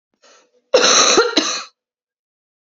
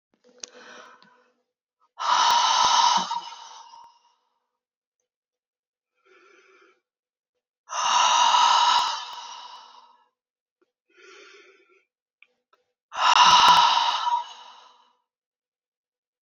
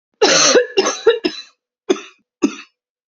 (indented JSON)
{
  "cough_length": "2.7 s",
  "cough_amplitude": 32767,
  "cough_signal_mean_std_ratio": 0.44,
  "exhalation_length": "16.2 s",
  "exhalation_amplitude": 23765,
  "exhalation_signal_mean_std_ratio": 0.4,
  "three_cough_length": "3.1 s",
  "three_cough_amplitude": 31178,
  "three_cough_signal_mean_std_ratio": 0.47,
  "survey_phase": "beta (2021-08-13 to 2022-03-07)",
  "age": "18-44",
  "gender": "Female",
  "wearing_mask": "No",
  "symptom_cough_any": true,
  "symptom_runny_or_blocked_nose": true,
  "symptom_sore_throat": true,
  "symptom_abdominal_pain": true,
  "symptom_fatigue": true,
  "symptom_headache": true,
  "symptom_other": true,
  "smoker_status": "Never smoked",
  "respiratory_condition_asthma": false,
  "respiratory_condition_other": false,
  "recruitment_source": "Test and Trace",
  "submission_delay": "1 day",
  "covid_test_result": "Positive",
  "covid_test_method": "RT-qPCR"
}